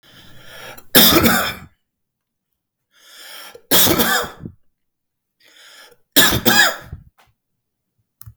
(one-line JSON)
{"three_cough_length": "8.4 s", "three_cough_amplitude": 32768, "three_cough_signal_mean_std_ratio": 0.38, "survey_phase": "beta (2021-08-13 to 2022-03-07)", "age": "45-64", "gender": "Male", "wearing_mask": "No", "symptom_fatigue": true, "symptom_onset": "12 days", "smoker_status": "Ex-smoker", "respiratory_condition_asthma": false, "respiratory_condition_other": false, "recruitment_source": "REACT", "submission_delay": "1 day", "covid_test_result": "Negative", "covid_test_method": "RT-qPCR"}